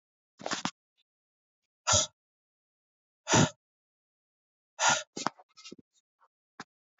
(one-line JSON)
{"exhalation_length": "7.0 s", "exhalation_amplitude": 12572, "exhalation_signal_mean_std_ratio": 0.26, "survey_phase": "beta (2021-08-13 to 2022-03-07)", "age": "45-64", "gender": "Male", "wearing_mask": "No", "symptom_cough_any": true, "symptom_runny_or_blocked_nose": true, "symptom_sore_throat": true, "symptom_headache": true, "symptom_other": true, "symptom_onset": "3 days", "smoker_status": "Never smoked", "respiratory_condition_asthma": false, "respiratory_condition_other": false, "recruitment_source": "Test and Trace", "submission_delay": "1 day", "covid_test_result": "Positive", "covid_test_method": "RT-qPCR", "covid_ct_value": 21.7, "covid_ct_gene": "N gene"}